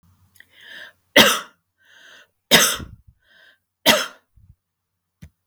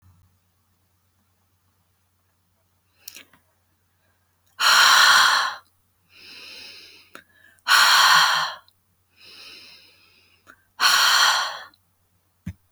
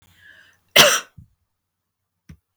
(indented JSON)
{
  "three_cough_length": "5.5 s",
  "three_cough_amplitude": 32768,
  "three_cough_signal_mean_std_ratio": 0.28,
  "exhalation_length": "12.7 s",
  "exhalation_amplitude": 25661,
  "exhalation_signal_mean_std_ratio": 0.38,
  "cough_length": "2.6 s",
  "cough_amplitude": 32768,
  "cough_signal_mean_std_ratio": 0.24,
  "survey_phase": "beta (2021-08-13 to 2022-03-07)",
  "age": "65+",
  "gender": "Female",
  "wearing_mask": "No",
  "symptom_fatigue": true,
  "smoker_status": "Never smoked",
  "respiratory_condition_asthma": false,
  "respiratory_condition_other": false,
  "recruitment_source": "REACT",
  "submission_delay": "2 days",
  "covid_test_result": "Negative",
  "covid_test_method": "RT-qPCR",
  "influenza_a_test_result": "Negative",
  "influenza_b_test_result": "Negative"
}